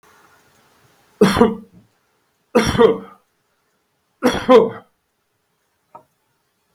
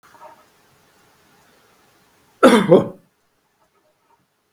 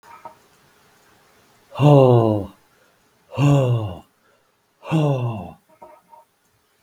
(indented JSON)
{
  "three_cough_length": "6.7 s",
  "three_cough_amplitude": 32768,
  "three_cough_signal_mean_std_ratio": 0.31,
  "cough_length": "4.5 s",
  "cough_amplitude": 32768,
  "cough_signal_mean_std_ratio": 0.24,
  "exhalation_length": "6.8 s",
  "exhalation_amplitude": 32766,
  "exhalation_signal_mean_std_ratio": 0.4,
  "survey_phase": "beta (2021-08-13 to 2022-03-07)",
  "age": "65+",
  "gender": "Male",
  "wearing_mask": "No",
  "symptom_none": true,
  "smoker_status": "Ex-smoker",
  "respiratory_condition_asthma": false,
  "respiratory_condition_other": false,
  "recruitment_source": "REACT",
  "submission_delay": "1 day",
  "covid_test_result": "Negative",
  "covid_test_method": "RT-qPCR",
  "influenza_a_test_result": "Negative",
  "influenza_b_test_result": "Negative"
}